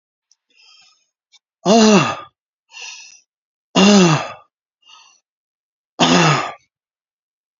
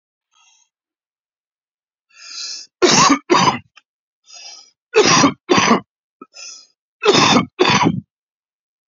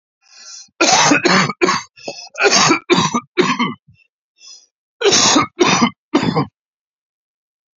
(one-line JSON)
{"exhalation_length": "7.6 s", "exhalation_amplitude": 30890, "exhalation_signal_mean_std_ratio": 0.37, "three_cough_length": "8.9 s", "three_cough_amplitude": 32768, "three_cough_signal_mean_std_ratio": 0.42, "cough_length": "7.8 s", "cough_amplitude": 32768, "cough_signal_mean_std_ratio": 0.53, "survey_phase": "beta (2021-08-13 to 2022-03-07)", "age": "65+", "gender": "Male", "wearing_mask": "No", "symptom_cough_any": true, "symptom_shortness_of_breath": true, "symptom_fatigue": true, "symptom_headache": true, "symptom_onset": "3 days", "smoker_status": "Ex-smoker", "respiratory_condition_asthma": true, "respiratory_condition_other": false, "recruitment_source": "Test and Trace", "submission_delay": "2 days", "covid_test_result": "Positive", "covid_test_method": "RT-qPCR", "covid_ct_value": 18.0, "covid_ct_gene": "ORF1ab gene", "covid_ct_mean": 18.3, "covid_viral_load": "1000000 copies/ml", "covid_viral_load_category": "High viral load (>1M copies/ml)"}